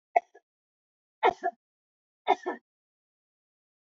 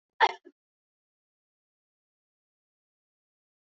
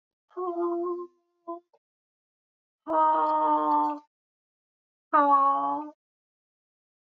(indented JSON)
{
  "three_cough_length": "3.8 s",
  "three_cough_amplitude": 12690,
  "three_cough_signal_mean_std_ratio": 0.21,
  "cough_length": "3.7 s",
  "cough_amplitude": 10980,
  "cough_signal_mean_std_ratio": 0.12,
  "exhalation_length": "7.2 s",
  "exhalation_amplitude": 10457,
  "exhalation_signal_mean_std_ratio": 0.52,
  "survey_phase": "beta (2021-08-13 to 2022-03-07)",
  "age": "65+",
  "gender": "Female",
  "wearing_mask": "No",
  "symptom_none": true,
  "smoker_status": "Never smoked",
  "respiratory_condition_asthma": false,
  "respiratory_condition_other": false,
  "recruitment_source": "REACT",
  "submission_delay": "2 days",
  "covid_test_result": "Negative",
  "covid_test_method": "RT-qPCR",
  "influenza_a_test_result": "Negative",
  "influenza_b_test_result": "Negative"
}